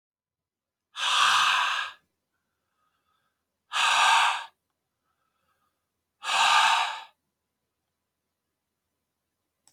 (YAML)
exhalation_length: 9.7 s
exhalation_amplitude: 11479
exhalation_signal_mean_std_ratio: 0.4
survey_phase: beta (2021-08-13 to 2022-03-07)
age: 45-64
gender: Male
wearing_mask: 'No'
symptom_cough_any: true
symptom_runny_or_blocked_nose: true
symptom_fatigue: true
symptom_fever_high_temperature: true
symptom_change_to_sense_of_smell_or_taste: true
symptom_loss_of_taste: true
symptom_onset: 4 days
smoker_status: Never smoked
respiratory_condition_asthma: false
respiratory_condition_other: false
recruitment_source: Test and Trace
submission_delay: 2 days
covid_test_result: Positive
covid_test_method: LAMP